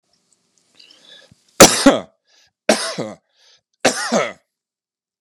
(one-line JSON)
{"three_cough_length": "5.2 s", "three_cough_amplitude": 32768, "three_cough_signal_mean_std_ratio": 0.29, "survey_phase": "beta (2021-08-13 to 2022-03-07)", "age": "65+", "gender": "Male", "wearing_mask": "No", "symptom_cough_any": true, "symptom_sore_throat": true, "symptom_onset": "12 days", "smoker_status": "Never smoked", "respiratory_condition_asthma": false, "respiratory_condition_other": false, "recruitment_source": "REACT", "submission_delay": "1 day", "covid_test_result": "Negative", "covid_test_method": "RT-qPCR"}